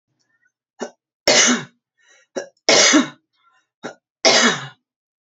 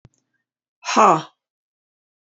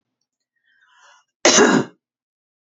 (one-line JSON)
{"three_cough_length": "5.3 s", "three_cough_amplitude": 30980, "three_cough_signal_mean_std_ratio": 0.38, "exhalation_length": "2.4 s", "exhalation_amplitude": 28483, "exhalation_signal_mean_std_ratio": 0.27, "cough_length": "2.7 s", "cough_amplitude": 32767, "cough_signal_mean_std_ratio": 0.31, "survey_phase": "beta (2021-08-13 to 2022-03-07)", "age": "45-64", "gender": "Female", "wearing_mask": "No", "symptom_none": true, "smoker_status": "Ex-smoker", "respiratory_condition_asthma": false, "respiratory_condition_other": false, "recruitment_source": "Test and Trace", "submission_delay": "2 days", "covid_test_result": "Negative", "covid_test_method": "ePCR"}